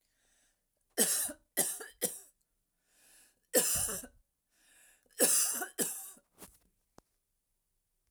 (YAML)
three_cough_length: 8.1 s
three_cough_amplitude: 11301
three_cough_signal_mean_std_ratio: 0.37
survey_phase: alpha (2021-03-01 to 2021-08-12)
age: 45-64
gender: Female
wearing_mask: 'No'
symptom_change_to_sense_of_smell_or_taste: true
symptom_onset: 12 days
smoker_status: Ex-smoker
respiratory_condition_asthma: false
respiratory_condition_other: false
recruitment_source: REACT
submission_delay: 1 day
covid_test_result: Negative
covid_test_method: RT-qPCR